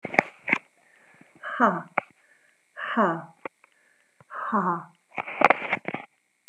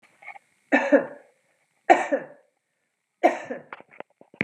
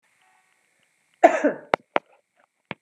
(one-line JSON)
{"exhalation_length": "6.5 s", "exhalation_amplitude": 32752, "exhalation_signal_mean_std_ratio": 0.35, "three_cough_length": "4.4 s", "three_cough_amplitude": 28068, "three_cough_signal_mean_std_ratio": 0.3, "cough_length": "2.8 s", "cough_amplitude": 32768, "cough_signal_mean_std_ratio": 0.21, "survey_phase": "beta (2021-08-13 to 2022-03-07)", "age": "45-64", "gender": "Female", "wearing_mask": "No", "symptom_none": true, "smoker_status": "Never smoked", "respiratory_condition_asthma": false, "respiratory_condition_other": false, "recruitment_source": "REACT", "submission_delay": "1 day", "covid_test_result": "Negative", "covid_test_method": "RT-qPCR"}